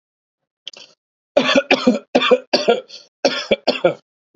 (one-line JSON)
{"three_cough_length": "4.4 s", "three_cough_amplitude": 30389, "three_cough_signal_mean_std_ratio": 0.43, "survey_phase": "beta (2021-08-13 to 2022-03-07)", "age": "18-44", "gender": "Male", "wearing_mask": "No", "symptom_none": true, "smoker_status": "Ex-smoker", "respiratory_condition_asthma": false, "respiratory_condition_other": false, "recruitment_source": "REACT", "submission_delay": "1 day", "covid_test_result": "Negative", "covid_test_method": "RT-qPCR", "influenza_a_test_result": "Negative", "influenza_b_test_result": "Negative"}